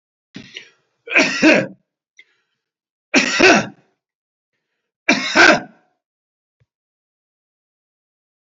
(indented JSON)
{
  "three_cough_length": "8.4 s",
  "three_cough_amplitude": 29433,
  "three_cough_signal_mean_std_ratio": 0.32,
  "survey_phase": "beta (2021-08-13 to 2022-03-07)",
  "age": "65+",
  "gender": "Male",
  "wearing_mask": "No",
  "symptom_none": true,
  "smoker_status": "Ex-smoker",
  "respiratory_condition_asthma": true,
  "respiratory_condition_other": false,
  "recruitment_source": "REACT",
  "submission_delay": "3 days",
  "covid_test_result": "Negative",
  "covid_test_method": "RT-qPCR"
}